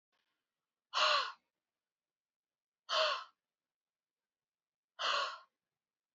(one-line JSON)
{"exhalation_length": "6.1 s", "exhalation_amplitude": 3690, "exhalation_signal_mean_std_ratio": 0.32, "survey_phase": "beta (2021-08-13 to 2022-03-07)", "age": "18-44", "gender": "Female", "wearing_mask": "No", "symptom_shortness_of_breath": true, "symptom_fatigue": true, "symptom_fever_high_temperature": true, "symptom_headache": true, "symptom_change_to_sense_of_smell_or_taste": true, "smoker_status": "Never smoked", "respiratory_condition_asthma": false, "respiratory_condition_other": false, "recruitment_source": "Test and Trace", "submission_delay": "2 days", "covid_test_result": "Positive", "covid_test_method": "RT-qPCR", "covid_ct_value": 19.1, "covid_ct_gene": "ORF1ab gene", "covid_ct_mean": 20.1, "covid_viral_load": "250000 copies/ml", "covid_viral_load_category": "Low viral load (10K-1M copies/ml)"}